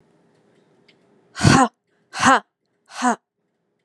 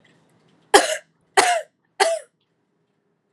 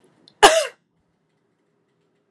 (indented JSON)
{
  "exhalation_length": "3.8 s",
  "exhalation_amplitude": 32552,
  "exhalation_signal_mean_std_ratio": 0.31,
  "three_cough_length": "3.3 s",
  "three_cough_amplitude": 32767,
  "three_cough_signal_mean_std_ratio": 0.32,
  "cough_length": "2.3 s",
  "cough_amplitude": 32768,
  "cough_signal_mean_std_ratio": 0.22,
  "survey_phase": "alpha (2021-03-01 to 2021-08-12)",
  "age": "18-44",
  "gender": "Female",
  "wearing_mask": "No",
  "symptom_none": true,
  "smoker_status": "Never smoked",
  "respiratory_condition_asthma": false,
  "respiratory_condition_other": false,
  "recruitment_source": "REACT",
  "submission_delay": "1 day",
  "covid_test_result": "Negative",
  "covid_test_method": "RT-qPCR"
}